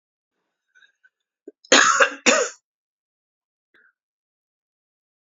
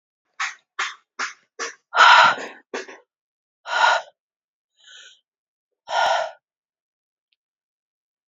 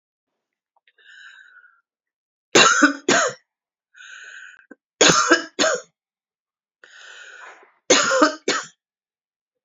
{"cough_length": "5.2 s", "cough_amplitude": 32449, "cough_signal_mean_std_ratio": 0.26, "exhalation_length": "8.3 s", "exhalation_amplitude": 28970, "exhalation_signal_mean_std_ratio": 0.31, "three_cough_length": "9.6 s", "three_cough_amplitude": 29736, "three_cough_signal_mean_std_ratio": 0.34, "survey_phase": "alpha (2021-03-01 to 2021-08-12)", "age": "45-64", "gender": "Female", "wearing_mask": "No", "symptom_cough_any": true, "symptom_shortness_of_breath": true, "symptom_diarrhoea": true, "symptom_fatigue": true, "symptom_fever_high_temperature": true, "symptom_change_to_sense_of_smell_or_taste": true, "symptom_loss_of_taste": true, "symptom_onset": "4 days", "smoker_status": "Never smoked", "respiratory_condition_asthma": true, "respiratory_condition_other": false, "recruitment_source": "Test and Trace", "submission_delay": "1 day", "covid_test_result": "Positive", "covid_test_method": "RT-qPCR"}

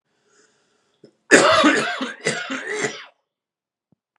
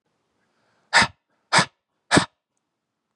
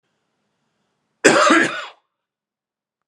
{"three_cough_length": "4.2 s", "three_cough_amplitude": 32765, "three_cough_signal_mean_std_ratio": 0.4, "exhalation_length": "3.2 s", "exhalation_amplitude": 30577, "exhalation_signal_mean_std_ratio": 0.26, "cough_length": "3.1 s", "cough_amplitude": 32768, "cough_signal_mean_std_ratio": 0.33, "survey_phase": "beta (2021-08-13 to 2022-03-07)", "age": "45-64", "gender": "Male", "wearing_mask": "No", "symptom_cough_any": true, "symptom_runny_or_blocked_nose": true, "symptom_diarrhoea": true, "symptom_fatigue": true, "symptom_fever_high_temperature": true, "symptom_headache": true, "smoker_status": "Ex-smoker", "respiratory_condition_asthma": false, "respiratory_condition_other": false, "recruitment_source": "Test and Trace", "submission_delay": "2 days", "covid_test_result": "Positive", "covid_test_method": "RT-qPCR", "covid_ct_value": 25.7, "covid_ct_gene": "ORF1ab gene", "covid_ct_mean": 26.3, "covid_viral_load": "2400 copies/ml", "covid_viral_load_category": "Minimal viral load (< 10K copies/ml)"}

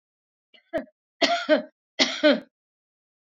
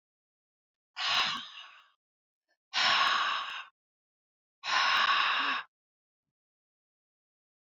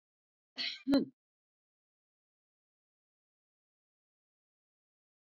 {"three_cough_length": "3.3 s", "three_cough_amplitude": 19567, "three_cough_signal_mean_std_ratio": 0.36, "exhalation_length": "7.8 s", "exhalation_amplitude": 6533, "exhalation_signal_mean_std_ratio": 0.45, "cough_length": "5.2 s", "cough_amplitude": 4194, "cough_signal_mean_std_ratio": 0.19, "survey_phase": "beta (2021-08-13 to 2022-03-07)", "age": "65+", "gender": "Female", "wearing_mask": "No", "symptom_none": true, "symptom_onset": "12 days", "smoker_status": "Never smoked", "respiratory_condition_asthma": false, "respiratory_condition_other": false, "recruitment_source": "REACT", "submission_delay": "2 days", "covid_test_result": "Negative", "covid_test_method": "RT-qPCR"}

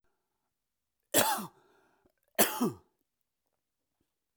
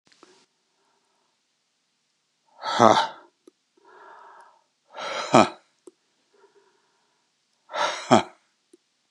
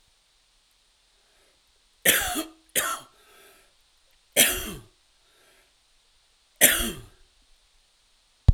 {"cough_length": "4.4 s", "cough_amplitude": 10767, "cough_signal_mean_std_ratio": 0.27, "exhalation_length": "9.1 s", "exhalation_amplitude": 31222, "exhalation_signal_mean_std_ratio": 0.23, "three_cough_length": "8.5 s", "three_cough_amplitude": 28701, "three_cough_signal_mean_std_ratio": 0.27, "survey_phase": "alpha (2021-03-01 to 2021-08-12)", "age": "45-64", "gender": "Male", "wearing_mask": "No", "symptom_none": true, "smoker_status": "Ex-smoker", "respiratory_condition_asthma": false, "respiratory_condition_other": false, "recruitment_source": "REACT", "submission_delay": "2 days", "covid_test_result": "Negative", "covid_test_method": "RT-qPCR"}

